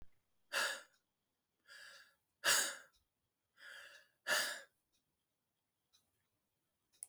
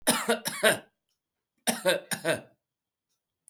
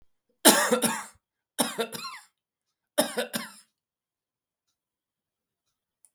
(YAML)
exhalation_length: 7.1 s
exhalation_amplitude: 3230
exhalation_signal_mean_std_ratio: 0.3
cough_length: 3.5 s
cough_amplitude: 17459
cough_signal_mean_std_ratio: 0.41
three_cough_length: 6.1 s
three_cough_amplitude: 32210
three_cough_signal_mean_std_ratio: 0.29
survey_phase: beta (2021-08-13 to 2022-03-07)
age: 65+
gender: Male
wearing_mask: 'No'
symptom_none: true
smoker_status: Never smoked
respiratory_condition_asthma: false
respiratory_condition_other: false
recruitment_source: REACT
submission_delay: 2 days
covid_test_result: Negative
covid_test_method: RT-qPCR
influenza_a_test_result: Negative
influenza_b_test_result: Negative